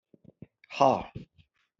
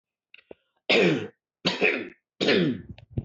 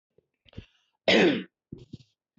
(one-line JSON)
{"exhalation_length": "1.8 s", "exhalation_amplitude": 14595, "exhalation_signal_mean_std_ratio": 0.27, "three_cough_length": "3.2 s", "three_cough_amplitude": 12142, "three_cough_signal_mean_std_ratio": 0.5, "cough_length": "2.4 s", "cough_amplitude": 12975, "cough_signal_mean_std_ratio": 0.32, "survey_phase": "beta (2021-08-13 to 2022-03-07)", "age": "45-64", "gender": "Male", "wearing_mask": "No", "symptom_none": true, "smoker_status": "Never smoked", "respiratory_condition_asthma": false, "respiratory_condition_other": false, "recruitment_source": "REACT", "submission_delay": "5 days", "covid_test_result": "Negative", "covid_test_method": "RT-qPCR", "covid_ct_value": 39.0, "covid_ct_gene": "N gene"}